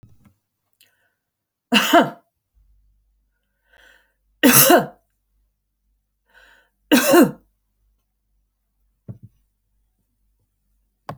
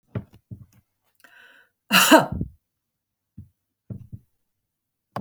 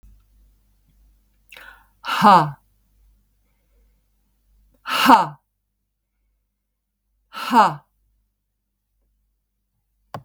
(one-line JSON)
{"three_cough_length": "11.2 s", "three_cough_amplitude": 32768, "three_cough_signal_mean_std_ratio": 0.26, "cough_length": "5.2 s", "cough_amplitude": 30967, "cough_signal_mean_std_ratio": 0.24, "exhalation_length": "10.2 s", "exhalation_amplitude": 30534, "exhalation_signal_mean_std_ratio": 0.24, "survey_phase": "alpha (2021-03-01 to 2021-08-12)", "age": "65+", "gender": "Female", "wearing_mask": "No", "symptom_none": true, "smoker_status": "Ex-smoker", "respiratory_condition_asthma": false, "respiratory_condition_other": false, "recruitment_source": "REACT", "submission_delay": "1 day", "covid_test_result": "Negative", "covid_test_method": "RT-qPCR"}